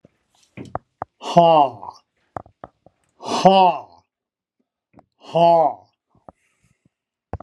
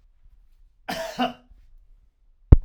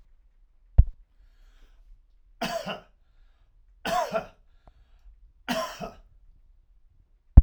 {"exhalation_length": "7.4 s", "exhalation_amplitude": 32768, "exhalation_signal_mean_std_ratio": 0.33, "cough_length": "2.6 s", "cough_amplitude": 32768, "cough_signal_mean_std_ratio": 0.2, "three_cough_length": "7.4 s", "three_cough_amplitude": 32768, "three_cough_signal_mean_std_ratio": 0.19, "survey_phase": "alpha (2021-03-01 to 2021-08-12)", "age": "65+", "gender": "Male", "wearing_mask": "No", "symptom_none": true, "smoker_status": "Never smoked", "respiratory_condition_asthma": true, "respiratory_condition_other": true, "recruitment_source": "REACT", "submission_delay": "2 days", "covid_test_result": "Negative", "covid_test_method": "RT-qPCR"}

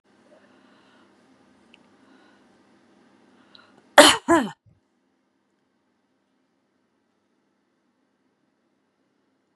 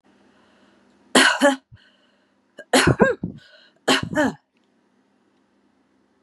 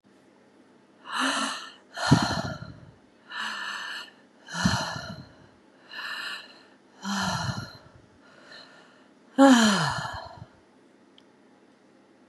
{"cough_length": "9.6 s", "cough_amplitude": 32768, "cough_signal_mean_std_ratio": 0.15, "three_cough_length": "6.2 s", "three_cough_amplitude": 29631, "three_cough_signal_mean_std_ratio": 0.34, "exhalation_length": "12.3 s", "exhalation_amplitude": 21497, "exhalation_signal_mean_std_ratio": 0.4, "survey_phase": "beta (2021-08-13 to 2022-03-07)", "age": "65+", "gender": "Female", "wearing_mask": "No", "symptom_none": true, "smoker_status": "Ex-smoker", "respiratory_condition_asthma": false, "respiratory_condition_other": false, "recruitment_source": "REACT", "submission_delay": "4 days", "covid_test_result": "Negative", "covid_test_method": "RT-qPCR", "influenza_a_test_result": "Negative", "influenza_b_test_result": "Negative"}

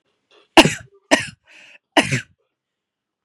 {"three_cough_length": "3.2 s", "three_cough_amplitude": 32768, "three_cough_signal_mean_std_ratio": 0.25, "survey_phase": "beta (2021-08-13 to 2022-03-07)", "age": "18-44", "gender": "Female", "wearing_mask": "No", "symptom_none": true, "smoker_status": "Never smoked", "respiratory_condition_asthma": false, "respiratory_condition_other": false, "recruitment_source": "REACT", "submission_delay": "2 days", "covid_test_result": "Negative", "covid_test_method": "RT-qPCR", "influenza_a_test_result": "Negative", "influenza_b_test_result": "Negative"}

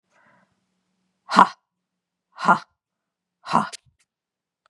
{"exhalation_length": "4.7 s", "exhalation_amplitude": 32768, "exhalation_signal_mean_std_ratio": 0.21, "survey_phase": "beta (2021-08-13 to 2022-03-07)", "age": "45-64", "gender": "Female", "wearing_mask": "No", "symptom_none": true, "smoker_status": "Ex-smoker", "respiratory_condition_asthma": false, "respiratory_condition_other": false, "recruitment_source": "REACT", "submission_delay": "2 days", "covid_test_result": "Negative", "covid_test_method": "RT-qPCR", "influenza_a_test_result": "Negative", "influenza_b_test_result": "Negative"}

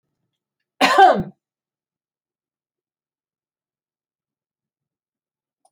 {"cough_length": "5.7 s", "cough_amplitude": 28561, "cough_signal_mean_std_ratio": 0.2, "survey_phase": "beta (2021-08-13 to 2022-03-07)", "age": "65+", "gender": "Female", "wearing_mask": "No", "symptom_none": true, "smoker_status": "Never smoked", "respiratory_condition_asthma": false, "respiratory_condition_other": false, "recruitment_source": "Test and Trace", "submission_delay": "0 days", "covid_test_result": "Negative", "covid_test_method": "LFT"}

